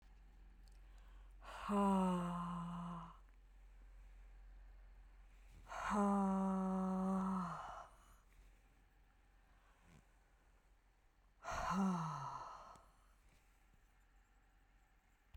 {"exhalation_length": "15.4 s", "exhalation_amplitude": 1420, "exhalation_signal_mean_std_ratio": 0.55, "survey_phase": "beta (2021-08-13 to 2022-03-07)", "age": "65+", "gender": "Female", "wearing_mask": "No", "symptom_none": true, "smoker_status": "Ex-smoker", "respiratory_condition_asthma": false, "respiratory_condition_other": false, "recruitment_source": "REACT", "submission_delay": "2 days", "covid_test_result": "Negative", "covid_test_method": "RT-qPCR"}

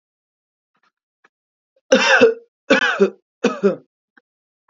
{"three_cough_length": "4.7 s", "three_cough_amplitude": 28060, "three_cough_signal_mean_std_ratio": 0.36, "survey_phase": "alpha (2021-03-01 to 2021-08-12)", "age": "18-44", "gender": "Female", "wearing_mask": "No", "symptom_none": true, "smoker_status": "Current smoker (1 to 10 cigarettes per day)", "respiratory_condition_asthma": false, "respiratory_condition_other": false, "recruitment_source": "REACT", "submission_delay": "5 days", "covid_test_result": "Negative", "covid_test_method": "RT-qPCR"}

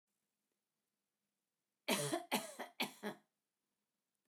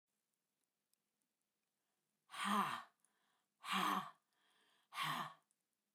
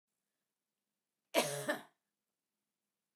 {"three_cough_length": "4.3 s", "three_cough_amplitude": 2527, "three_cough_signal_mean_std_ratio": 0.32, "exhalation_length": "5.9 s", "exhalation_amplitude": 1760, "exhalation_signal_mean_std_ratio": 0.36, "cough_length": "3.2 s", "cough_amplitude": 4255, "cough_signal_mean_std_ratio": 0.25, "survey_phase": "beta (2021-08-13 to 2022-03-07)", "age": "65+", "gender": "Female", "wearing_mask": "No", "symptom_none": true, "smoker_status": "Ex-smoker", "respiratory_condition_asthma": false, "respiratory_condition_other": false, "recruitment_source": "REACT", "submission_delay": "2 days", "covid_test_result": "Negative", "covid_test_method": "RT-qPCR", "influenza_a_test_result": "Negative", "influenza_b_test_result": "Negative"}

